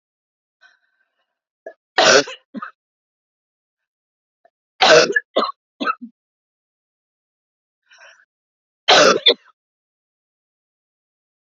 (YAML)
three_cough_length: 11.4 s
three_cough_amplitude: 31624
three_cough_signal_mean_std_ratio: 0.26
survey_phase: beta (2021-08-13 to 2022-03-07)
age: 18-44
gender: Female
wearing_mask: 'No'
symptom_none: true
symptom_onset: 11 days
smoker_status: Never smoked
respiratory_condition_asthma: false
respiratory_condition_other: false
recruitment_source: REACT
submission_delay: -1 day
covid_test_result: Negative
covid_test_method: RT-qPCR
influenza_a_test_result: Negative
influenza_b_test_result: Negative